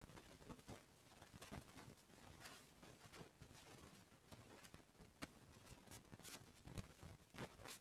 {"exhalation_length": "7.8 s", "exhalation_amplitude": 510, "exhalation_signal_mean_std_ratio": 0.74, "survey_phase": "beta (2021-08-13 to 2022-03-07)", "age": "65+", "gender": "Male", "wearing_mask": "No", "symptom_none": true, "smoker_status": "Ex-smoker", "respiratory_condition_asthma": false, "respiratory_condition_other": false, "recruitment_source": "REACT", "submission_delay": "4 days", "covid_test_result": "Negative", "covid_test_method": "RT-qPCR", "influenza_a_test_result": "Negative", "influenza_b_test_result": "Negative"}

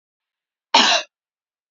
{"cough_length": "1.7 s", "cough_amplitude": 27505, "cough_signal_mean_std_ratio": 0.31, "survey_phase": "beta (2021-08-13 to 2022-03-07)", "age": "18-44", "gender": "Female", "wearing_mask": "No", "symptom_none": true, "smoker_status": "Never smoked", "respiratory_condition_asthma": false, "respiratory_condition_other": false, "recruitment_source": "REACT", "submission_delay": "1 day", "covid_test_result": "Negative", "covid_test_method": "RT-qPCR", "influenza_a_test_result": "Negative", "influenza_b_test_result": "Negative"}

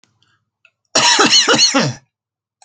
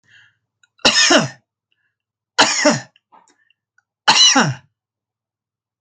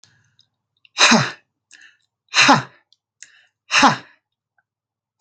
{"cough_length": "2.6 s", "cough_amplitude": 32767, "cough_signal_mean_std_ratio": 0.52, "three_cough_length": "5.8 s", "three_cough_amplitude": 32767, "three_cough_signal_mean_std_ratio": 0.38, "exhalation_length": "5.2 s", "exhalation_amplitude": 32768, "exhalation_signal_mean_std_ratio": 0.31, "survey_phase": "beta (2021-08-13 to 2022-03-07)", "age": "45-64", "gender": "Male", "wearing_mask": "No", "symptom_none": true, "smoker_status": "Prefer not to say", "respiratory_condition_asthma": true, "respiratory_condition_other": false, "recruitment_source": "REACT", "submission_delay": "1 day", "covid_test_result": "Negative", "covid_test_method": "RT-qPCR"}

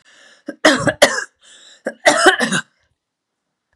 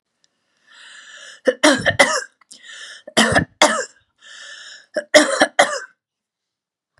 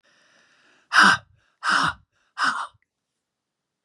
{"cough_length": "3.8 s", "cough_amplitude": 32768, "cough_signal_mean_std_ratio": 0.39, "three_cough_length": "7.0 s", "three_cough_amplitude": 32768, "three_cough_signal_mean_std_ratio": 0.37, "exhalation_length": "3.8 s", "exhalation_amplitude": 23908, "exhalation_signal_mean_std_ratio": 0.34, "survey_phase": "beta (2021-08-13 to 2022-03-07)", "age": "65+", "gender": "Female", "wearing_mask": "No", "symptom_none": true, "smoker_status": "Never smoked", "respiratory_condition_asthma": false, "respiratory_condition_other": false, "recruitment_source": "REACT", "submission_delay": "2 days", "covid_test_result": "Negative", "covid_test_method": "RT-qPCR", "influenza_a_test_result": "Negative", "influenza_b_test_result": "Negative"}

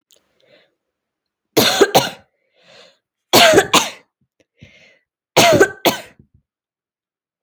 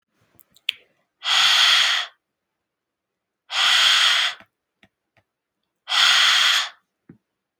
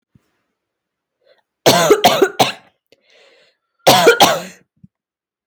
{"three_cough_length": "7.4 s", "three_cough_amplitude": 32767, "three_cough_signal_mean_std_ratio": 0.34, "exhalation_length": "7.6 s", "exhalation_amplitude": 28978, "exhalation_signal_mean_std_ratio": 0.48, "cough_length": "5.5 s", "cough_amplitude": 32768, "cough_signal_mean_std_ratio": 0.38, "survey_phase": "alpha (2021-03-01 to 2021-08-12)", "age": "18-44", "gender": "Female", "wearing_mask": "No", "symptom_cough_any": true, "symptom_fatigue": true, "symptom_headache": true, "symptom_change_to_sense_of_smell_or_taste": true, "symptom_loss_of_taste": true, "symptom_onset": "4 days", "smoker_status": "Never smoked", "respiratory_condition_asthma": false, "respiratory_condition_other": false, "recruitment_source": "Test and Trace", "submission_delay": "2 days", "covid_test_result": "Positive", "covid_test_method": "RT-qPCR"}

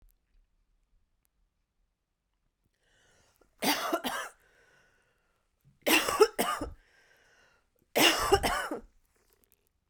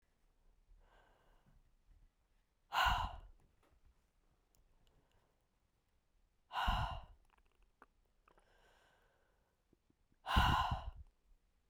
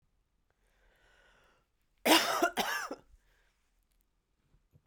{"three_cough_length": "9.9 s", "three_cough_amplitude": 13603, "three_cough_signal_mean_std_ratio": 0.32, "exhalation_length": "11.7 s", "exhalation_amplitude": 3240, "exhalation_signal_mean_std_ratio": 0.29, "cough_length": "4.9 s", "cough_amplitude": 10321, "cough_signal_mean_std_ratio": 0.29, "survey_phase": "beta (2021-08-13 to 2022-03-07)", "age": "45-64", "gender": "Female", "wearing_mask": "No", "symptom_new_continuous_cough": true, "symptom_runny_or_blocked_nose": true, "symptom_sore_throat": true, "symptom_fatigue": true, "symptom_fever_high_temperature": true, "symptom_headache": true, "symptom_onset": "3 days", "smoker_status": "Ex-smoker", "respiratory_condition_asthma": true, "respiratory_condition_other": false, "recruitment_source": "Test and Trace", "submission_delay": "2 days", "covid_test_result": "Positive", "covid_test_method": "RT-qPCR"}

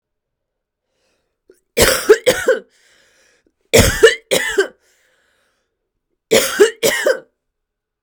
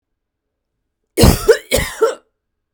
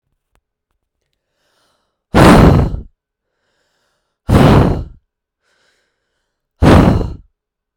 {"three_cough_length": "8.0 s", "three_cough_amplitude": 32768, "three_cough_signal_mean_std_ratio": 0.37, "cough_length": "2.7 s", "cough_amplitude": 32768, "cough_signal_mean_std_ratio": 0.36, "exhalation_length": "7.8 s", "exhalation_amplitude": 32768, "exhalation_signal_mean_std_ratio": 0.37, "survey_phase": "beta (2021-08-13 to 2022-03-07)", "age": "18-44", "gender": "Female", "wearing_mask": "No", "symptom_cough_any": true, "symptom_runny_or_blocked_nose": true, "symptom_shortness_of_breath": true, "symptom_sore_throat": true, "symptom_fatigue": true, "symptom_fever_high_temperature": true, "symptom_headache": true, "symptom_loss_of_taste": true, "symptom_onset": "3 days", "smoker_status": "Ex-smoker", "respiratory_condition_asthma": false, "respiratory_condition_other": false, "recruitment_source": "Test and Trace", "submission_delay": "2 days", "covid_test_result": "Positive", "covid_test_method": "RT-qPCR", "covid_ct_value": 25.0, "covid_ct_gene": "ORF1ab gene"}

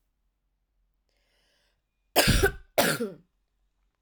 {"cough_length": "4.0 s", "cough_amplitude": 17013, "cough_signal_mean_std_ratio": 0.32, "survey_phase": "alpha (2021-03-01 to 2021-08-12)", "age": "18-44", "gender": "Female", "wearing_mask": "No", "symptom_cough_any": true, "symptom_fatigue": true, "symptom_onset": "2 days", "smoker_status": "Never smoked", "respiratory_condition_asthma": false, "respiratory_condition_other": false, "recruitment_source": "Test and Trace", "submission_delay": "1 day", "covid_test_result": "Positive", "covid_test_method": "RT-qPCR", "covid_ct_value": 21.7, "covid_ct_gene": "ORF1ab gene", "covid_ct_mean": 22.3, "covid_viral_load": "48000 copies/ml", "covid_viral_load_category": "Low viral load (10K-1M copies/ml)"}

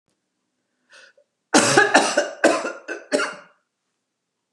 {"cough_length": "4.5 s", "cough_amplitude": 32736, "cough_signal_mean_std_ratio": 0.39, "survey_phase": "beta (2021-08-13 to 2022-03-07)", "age": "65+", "gender": "Female", "wearing_mask": "No", "symptom_abdominal_pain": true, "symptom_other": true, "smoker_status": "Never smoked", "respiratory_condition_asthma": false, "respiratory_condition_other": false, "recruitment_source": "Test and Trace", "submission_delay": "1 day", "covid_test_result": "Negative", "covid_test_method": "RT-qPCR"}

